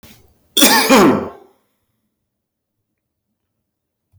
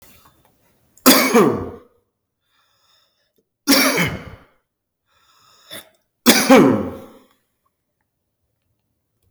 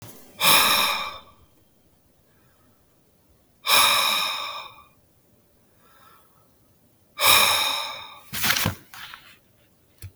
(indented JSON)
{
  "cough_length": "4.2 s",
  "cough_amplitude": 32768,
  "cough_signal_mean_std_ratio": 0.34,
  "three_cough_length": "9.3 s",
  "three_cough_amplitude": 32768,
  "three_cough_signal_mean_std_ratio": 0.33,
  "exhalation_length": "10.2 s",
  "exhalation_amplitude": 27393,
  "exhalation_signal_mean_std_ratio": 0.42,
  "survey_phase": "beta (2021-08-13 to 2022-03-07)",
  "age": "45-64",
  "gender": "Male",
  "wearing_mask": "No",
  "symptom_cough_any": true,
  "symptom_fever_high_temperature": true,
  "smoker_status": "Ex-smoker",
  "respiratory_condition_asthma": false,
  "respiratory_condition_other": false,
  "recruitment_source": "Test and Trace",
  "submission_delay": "2 days",
  "covid_test_result": "Positive",
  "covid_test_method": "RT-qPCR"
}